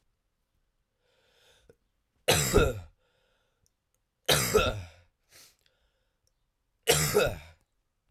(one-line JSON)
{"three_cough_length": "8.1 s", "three_cough_amplitude": 14082, "three_cough_signal_mean_std_ratio": 0.33, "survey_phase": "alpha (2021-03-01 to 2021-08-12)", "age": "18-44", "gender": "Male", "wearing_mask": "No", "symptom_new_continuous_cough": true, "symptom_shortness_of_breath": true, "symptom_diarrhoea": true, "symptom_fatigue": true, "symptom_fever_high_temperature": true, "symptom_headache": true, "symptom_onset": "8 days", "smoker_status": "Ex-smoker", "respiratory_condition_asthma": false, "respiratory_condition_other": false, "recruitment_source": "Test and Trace", "submission_delay": "1 day", "covid_test_result": "Positive", "covid_test_method": "RT-qPCR", "covid_ct_value": 17.8, "covid_ct_gene": "N gene"}